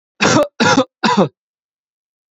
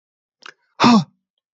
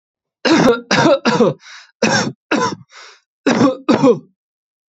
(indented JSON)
{
  "cough_length": "2.3 s",
  "cough_amplitude": 28889,
  "cough_signal_mean_std_ratio": 0.48,
  "exhalation_length": "1.5 s",
  "exhalation_amplitude": 28099,
  "exhalation_signal_mean_std_ratio": 0.33,
  "three_cough_length": "4.9 s",
  "three_cough_amplitude": 31158,
  "three_cough_signal_mean_std_ratio": 0.55,
  "survey_phase": "beta (2021-08-13 to 2022-03-07)",
  "age": "18-44",
  "gender": "Male",
  "wearing_mask": "No",
  "symptom_none": true,
  "smoker_status": "Never smoked",
  "respiratory_condition_asthma": false,
  "respiratory_condition_other": false,
  "recruitment_source": "REACT",
  "submission_delay": "0 days",
  "covid_test_result": "Negative",
  "covid_test_method": "RT-qPCR"
}